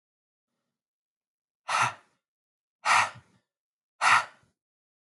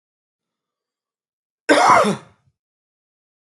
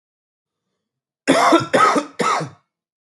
exhalation_length: 5.1 s
exhalation_amplitude: 12459
exhalation_signal_mean_std_ratio: 0.28
cough_length: 3.5 s
cough_amplitude: 31280
cough_signal_mean_std_ratio: 0.29
three_cough_length: 3.1 s
three_cough_amplitude: 30078
three_cough_signal_mean_std_ratio: 0.46
survey_phase: beta (2021-08-13 to 2022-03-07)
age: 18-44
gender: Male
wearing_mask: 'No'
symptom_cough_any: true
symptom_runny_or_blocked_nose: true
symptom_shortness_of_breath: true
symptom_sore_throat: true
symptom_fatigue: true
symptom_headache: true
symptom_change_to_sense_of_smell_or_taste: true
symptom_other: true
symptom_onset: 6 days
smoker_status: Ex-smoker
respiratory_condition_asthma: false
respiratory_condition_other: true
recruitment_source: Test and Trace
submission_delay: 2 days
covid_test_result: Positive
covid_test_method: ePCR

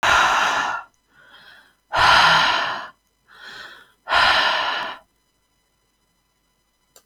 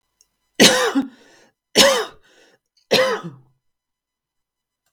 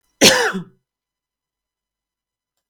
exhalation_length: 7.1 s
exhalation_amplitude: 26374
exhalation_signal_mean_std_ratio: 0.5
three_cough_length: 4.9 s
three_cough_amplitude: 32768
three_cough_signal_mean_std_ratio: 0.35
cough_length: 2.7 s
cough_amplitude: 32768
cough_signal_mean_std_ratio: 0.27
survey_phase: beta (2021-08-13 to 2022-03-07)
age: 45-64
gender: Female
wearing_mask: 'No'
symptom_none: true
smoker_status: Never smoked
respiratory_condition_asthma: false
respiratory_condition_other: false
recruitment_source: REACT
submission_delay: 7 days
covid_test_result: Negative
covid_test_method: RT-qPCR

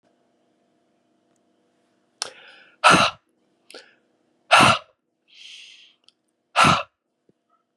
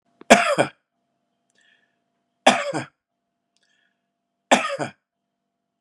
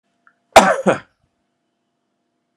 exhalation_length: 7.8 s
exhalation_amplitude: 32083
exhalation_signal_mean_std_ratio: 0.26
three_cough_length: 5.8 s
three_cough_amplitude: 32768
three_cough_signal_mean_std_ratio: 0.26
cough_length: 2.6 s
cough_amplitude: 32768
cough_signal_mean_std_ratio: 0.25
survey_phase: beta (2021-08-13 to 2022-03-07)
age: 45-64
gender: Male
wearing_mask: 'No'
symptom_none: true
smoker_status: Never smoked
respiratory_condition_asthma: true
respiratory_condition_other: false
recruitment_source: REACT
submission_delay: 1 day
covid_test_result: Negative
covid_test_method: RT-qPCR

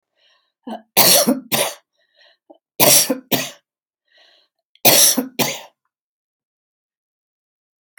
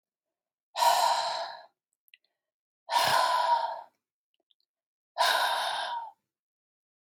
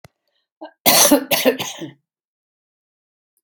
three_cough_length: 8.0 s
three_cough_amplitude: 32768
three_cough_signal_mean_std_ratio: 0.35
exhalation_length: 7.1 s
exhalation_amplitude: 8468
exhalation_signal_mean_std_ratio: 0.49
cough_length: 3.4 s
cough_amplitude: 32768
cough_signal_mean_std_ratio: 0.35
survey_phase: alpha (2021-03-01 to 2021-08-12)
age: 65+
gender: Female
wearing_mask: 'No'
symptom_none: true
smoker_status: Never smoked
respiratory_condition_asthma: false
respiratory_condition_other: false
recruitment_source: REACT
submission_delay: 1 day
covid_test_result: Negative
covid_test_method: RT-qPCR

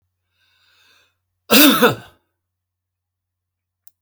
cough_length: 4.0 s
cough_amplitude: 32768
cough_signal_mean_std_ratio: 0.26
survey_phase: alpha (2021-03-01 to 2021-08-12)
age: 65+
gender: Male
wearing_mask: 'No'
symptom_none: true
smoker_status: Never smoked
respiratory_condition_asthma: false
respiratory_condition_other: false
recruitment_source: REACT
submission_delay: 2 days
covid_test_result: Negative
covid_test_method: RT-qPCR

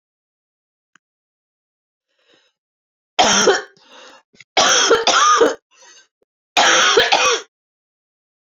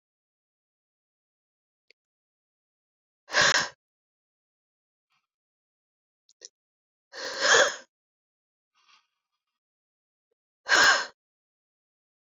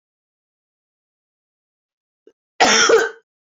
three_cough_length: 8.5 s
three_cough_amplitude: 30930
three_cough_signal_mean_std_ratio: 0.43
exhalation_length: 12.4 s
exhalation_amplitude: 19920
exhalation_signal_mean_std_ratio: 0.23
cough_length: 3.6 s
cough_amplitude: 29034
cough_signal_mean_std_ratio: 0.3
survey_phase: beta (2021-08-13 to 2022-03-07)
age: 45-64
gender: Female
wearing_mask: 'No'
symptom_cough_any: true
symptom_runny_or_blocked_nose: true
symptom_shortness_of_breath: true
symptom_fatigue: true
symptom_headache: true
symptom_change_to_sense_of_smell_or_taste: true
symptom_loss_of_taste: true
symptom_onset: 4 days
smoker_status: Never smoked
respiratory_condition_asthma: true
respiratory_condition_other: false
recruitment_source: Test and Trace
submission_delay: 2 days
covid_test_result: Positive
covid_test_method: RT-qPCR
covid_ct_value: 20.7
covid_ct_gene: S gene
covid_ct_mean: 21.8
covid_viral_load: 72000 copies/ml
covid_viral_load_category: Low viral load (10K-1M copies/ml)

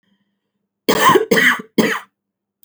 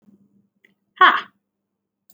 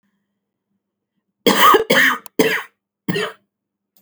three_cough_length: 2.6 s
three_cough_amplitude: 31567
three_cough_signal_mean_std_ratio: 0.46
exhalation_length: 2.1 s
exhalation_amplitude: 28804
exhalation_signal_mean_std_ratio: 0.23
cough_length: 4.0 s
cough_amplitude: 32768
cough_signal_mean_std_ratio: 0.4
survey_phase: alpha (2021-03-01 to 2021-08-12)
age: 18-44
gender: Female
wearing_mask: 'No'
symptom_headache: true
smoker_status: Never smoked
respiratory_condition_asthma: false
respiratory_condition_other: false
recruitment_source: Test and Trace
submission_delay: 0 days
covid_test_result: Negative
covid_test_method: LFT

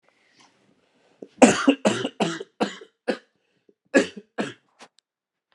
cough_length: 5.5 s
cough_amplitude: 32767
cough_signal_mean_std_ratio: 0.29
survey_phase: beta (2021-08-13 to 2022-03-07)
age: 45-64
gender: Male
wearing_mask: 'No'
symptom_cough_any: true
symptom_new_continuous_cough: true
symptom_runny_or_blocked_nose: true
symptom_shortness_of_breath: true
symptom_sore_throat: true
symptom_fatigue: true
symptom_fever_high_temperature: true
symptom_headache: true
symptom_change_to_sense_of_smell_or_taste: true
symptom_onset: 3 days
smoker_status: Never smoked
respiratory_condition_asthma: false
respiratory_condition_other: false
recruitment_source: Test and Trace
submission_delay: 1 day
covid_test_result: Positive
covid_test_method: RT-qPCR
covid_ct_value: 19.4
covid_ct_gene: ORF1ab gene
covid_ct_mean: 19.7
covid_viral_load: 330000 copies/ml
covid_viral_load_category: Low viral load (10K-1M copies/ml)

